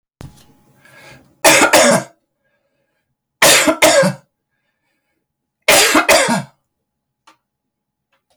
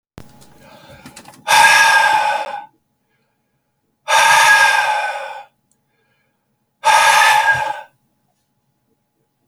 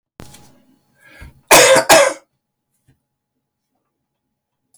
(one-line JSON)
{"three_cough_length": "8.4 s", "three_cough_amplitude": 32767, "three_cough_signal_mean_std_ratio": 0.41, "exhalation_length": "9.5 s", "exhalation_amplitude": 32768, "exhalation_signal_mean_std_ratio": 0.49, "cough_length": "4.8 s", "cough_amplitude": 32768, "cough_signal_mean_std_ratio": 0.29, "survey_phase": "alpha (2021-03-01 to 2021-08-12)", "age": "65+", "gender": "Male", "wearing_mask": "No", "symptom_none": true, "smoker_status": "Ex-smoker", "respiratory_condition_asthma": false, "respiratory_condition_other": false, "recruitment_source": "REACT", "submission_delay": "3 days", "covid_test_result": "Negative", "covid_test_method": "RT-qPCR"}